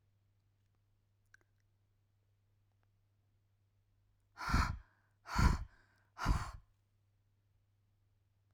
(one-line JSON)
{"exhalation_length": "8.5 s", "exhalation_amplitude": 4898, "exhalation_signal_mean_std_ratio": 0.26, "survey_phase": "alpha (2021-03-01 to 2021-08-12)", "age": "18-44", "gender": "Female", "wearing_mask": "No", "symptom_none": true, "smoker_status": "Never smoked", "respiratory_condition_asthma": false, "respiratory_condition_other": false, "recruitment_source": "REACT", "submission_delay": "2 days", "covid_test_result": "Negative", "covid_test_method": "RT-qPCR"}